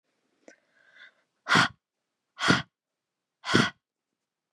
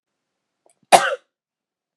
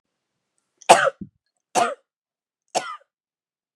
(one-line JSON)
{"exhalation_length": "4.5 s", "exhalation_amplitude": 16519, "exhalation_signal_mean_std_ratio": 0.28, "cough_length": "2.0 s", "cough_amplitude": 32768, "cough_signal_mean_std_ratio": 0.21, "three_cough_length": "3.8 s", "three_cough_amplitude": 32768, "three_cough_signal_mean_std_ratio": 0.24, "survey_phase": "beta (2021-08-13 to 2022-03-07)", "age": "18-44", "gender": "Female", "wearing_mask": "No", "symptom_none": true, "smoker_status": "Never smoked", "respiratory_condition_asthma": false, "respiratory_condition_other": false, "recruitment_source": "REACT", "submission_delay": "2 days", "covid_test_result": "Negative", "covid_test_method": "RT-qPCR", "influenza_a_test_result": "Negative", "influenza_b_test_result": "Negative"}